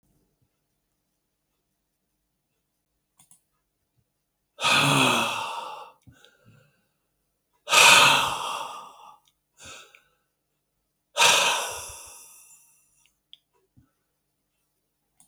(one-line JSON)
{"exhalation_length": "15.3 s", "exhalation_amplitude": 28862, "exhalation_signal_mean_std_ratio": 0.3, "survey_phase": "beta (2021-08-13 to 2022-03-07)", "age": "65+", "gender": "Male", "wearing_mask": "No", "symptom_cough_any": true, "symptom_runny_or_blocked_nose": true, "symptom_sore_throat": true, "smoker_status": "Ex-smoker", "respiratory_condition_asthma": false, "respiratory_condition_other": false, "recruitment_source": "Test and Trace", "submission_delay": "2 days", "covid_test_result": "Positive", "covid_test_method": "RT-qPCR"}